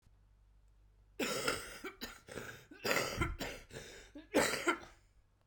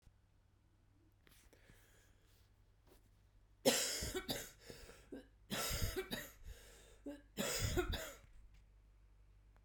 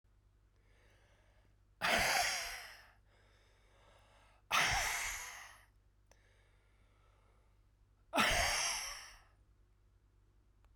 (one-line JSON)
{"cough_length": "5.5 s", "cough_amplitude": 4715, "cough_signal_mean_std_ratio": 0.5, "three_cough_length": "9.6 s", "three_cough_amplitude": 4579, "three_cough_signal_mean_std_ratio": 0.44, "exhalation_length": "10.8 s", "exhalation_amplitude": 3950, "exhalation_signal_mean_std_ratio": 0.41, "survey_phase": "beta (2021-08-13 to 2022-03-07)", "age": "45-64", "gender": "Female", "wearing_mask": "No", "symptom_cough_any": true, "symptom_runny_or_blocked_nose": true, "symptom_sore_throat": true, "symptom_abdominal_pain": true, "symptom_fatigue": true, "symptom_headache": true, "symptom_change_to_sense_of_smell_or_taste": true, "symptom_onset": "4 days", "smoker_status": "Never smoked", "respiratory_condition_asthma": true, "respiratory_condition_other": false, "recruitment_source": "Test and Trace", "submission_delay": "2 days", "covid_test_result": "Positive", "covid_test_method": "RT-qPCR", "covid_ct_value": 24.4, "covid_ct_gene": "ORF1ab gene"}